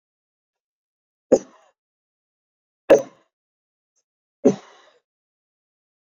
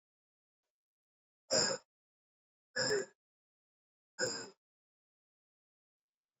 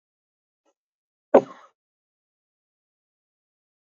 {"three_cough_length": "6.1 s", "three_cough_amplitude": 27249, "three_cough_signal_mean_std_ratio": 0.16, "exhalation_length": "6.4 s", "exhalation_amplitude": 4000, "exhalation_signal_mean_std_ratio": 0.27, "cough_length": "3.9 s", "cough_amplitude": 26744, "cough_signal_mean_std_ratio": 0.1, "survey_phase": "beta (2021-08-13 to 2022-03-07)", "age": "45-64", "gender": "Male", "wearing_mask": "Yes", "symptom_cough_any": true, "symptom_runny_or_blocked_nose": true, "symptom_fatigue": true, "symptom_headache": true, "smoker_status": "Ex-smoker", "respiratory_condition_asthma": false, "respiratory_condition_other": false, "recruitment_source": "Test and Trace", "submission_delay": "2 days", "covid_test_result": "Positive", "covid_test_method": "RT-qPCR", "covid_ct_value": 22.1, "covid_ct_gene": "ORF1ab gene", "covid_ct_mean": 22.8, "covid_viral_load": "34000 copies/ml", "covid_viral_load_category": "Low viral load (10K-1M copies/ml)"}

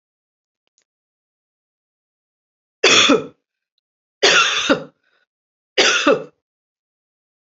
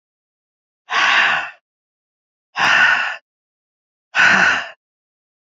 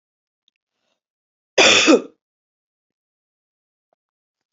{"three_cough_length": "7.4 s", "three_cough_amplitude": 31650, "three_cough_signal_mean_std_ratio": 0.34, "exhalation_length": "5.5 s", "exhalation_amplitude": 29028, "exhalation_signal_mean_std_ratio": 0.45, "cough_length": "4.5 s", "cough_amplitude": 32768, "cough_signal_mean_std_ratio": 0.25, "survey_phase": "beta (2021-08-13 to 2022-03-07)", "age": "45-64", "gender": "Female", "wearing_mask": "No", "symptom_cough_any": true, "symptom_runny_or_blocked_nose": true, "symptom_fatigue": true, "symptom_onset": "3 days", "smoker_status": "Never smoked", "respiratory_condition_asthma": true, "respiratory_condition_other": false, "recruitment_source": "Test and Trace", "submission_delay": "2 days", "covid_test_result": "Positive", "covid_test_method": "RT-qPCR", "covid_ct_value": 17.9, "covid_ct_gene": "N gene"}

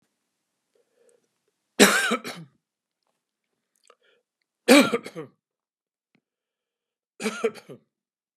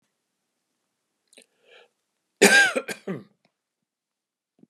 {"three_cough_length": "8.4 s", "three_cough_amplitude": 31997, "three_cough_signal_mean_std_ratio": 0.23, "cough_length": "4.7 s", "cough_amplitude": 26074, "cough_signal_mean_std_ratio": 0.23, "survey_phase": "beta (2021-08-13 to 2022-03-07)", "age": "65+", "gender": "Male", "wearing_mask": "No", "symptom_none": true, "smoker_status": "Ex-smoker", "respiratory_condition_asthma": false, "respiratory_condition_other": false, "recruitment_source": "REACT", "submission_delay": "2 days", "covid_test_result": "Negative", "covid_test_method": "RT-qPCR", "influenza_a_test_result": "Unknown/Void", "influenza_b_test_result": "Unknown/Void"}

